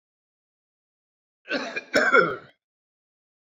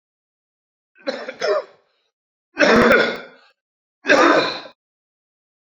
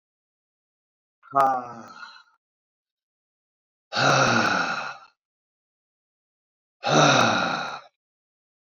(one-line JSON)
{"cough_length": "3.6 s", "cough_amplitude": 19722, "cough_signal_mean_std_ratio": 0.31, "three_cough_length": "5.6 s", "three_cough_amplitude": 28671, "three_cough_signal_mean_std_ratio": 0.4, "exhalation_length": "8.6 s", "exhalation_amplitude": 18829, "exhalation_signal_mean_std_ratio": 0.4, "survey_phase": "beta (2021-08-13 to 2022-03-07)", "age": "45-64", "gender": "Male", "wearing_mask": "No", "symptom_cough_any": true, "smoker_status": "Ex-smoker", "respiratory_condition_asthma": false, "respiratory_condition_other": false, "recruitment_source": "REACT", "submission_delay": "5 days", "covid_test_result": "Negative", "covid_test_method": "RT-qPCR"}